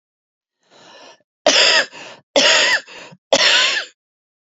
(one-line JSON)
{"three_cough_length": "4.4 s", "three_cough_amplitude": 30806, "three_cough_signal_mean_std_ratio": 0.48, "survey_phase": "beta (2021-08-13 to 2022-03-07)", "age": "18-44", "gender": "Female", "wearing_mask": "No", "symptom_cough_any": true, "symptom_runny_or_blocked_nose": true, "symptom_sore_throat": true, "symptom_fatigue": true, "symptom_fever_high_temperature": true, "symptom_headache": true, "symptom_onset": "3 days", "smoker_status": "Ex-smoker", "respiratory_condition_asthma": false, "respiratory_condition_other": false, "recruitment_source": "Test and Trace", "submission_delay": "1 day", "covid_test_result": "Positive", "covid_test_method": "RT-qPCR", "covid_ct_value": 16.9, "covid_ct_gene": "N gene"}